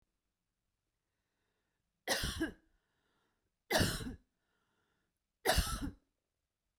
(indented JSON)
{
  "three_cough_length": "6.8 s",
  "three_cough_amplitude": 4028,
  "three_cough_signal_mean_std_ratio": 0.32,
  "survey_phase": "beta (2021-08-13 to 2022-03-07)",
  "age": "18-44",
  "gender": "Female",
  "wearing_mask": "No",
  "symptom_none": true,
  "smoker_status": "Never smoked",
  "respiratory_condition_asthma": false,
  "respiratory_condition_other": false,
  "recruitment_source": "REACT",
  "submission_delay": "1 day",
  "covid_test_result": "Negative",
  "covid_test_method": "RT-qPCR"
}